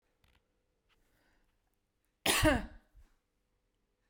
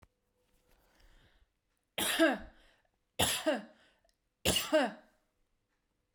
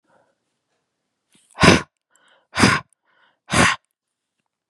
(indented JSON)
{
  "cough_length": "4.1 s",
  "cough_amplitude": 5637,
  "cough_signal_mean_std_ratio": 0.25,
  "three_cough_length": "6.1 s",
  "three_cough_amplitude": 6927,
  "three_cough_signal_mean_std_ratio": 0.36,
  "exhalation_length": "4.7 s",
  "exhalation_amplitude": 32768,
  "exhalation_signal_mean_std_ratio": 0.28,
  "survey_phase": "beta (2021-08-13 to 2022-03-07)",
  "age": "18-44",
  "gender": "Female",
  "wearing_mask": "No",
  "symptom_none": true,
  "smoker_status": "Never smoked",
  "respiratory_condition_asthma": true,
  "respiratory_condition_other": false,
  "recruitment_source": "REACT",
  "submission_delay": "11 days",
  "covid_test_method": "RT-qPCR"
}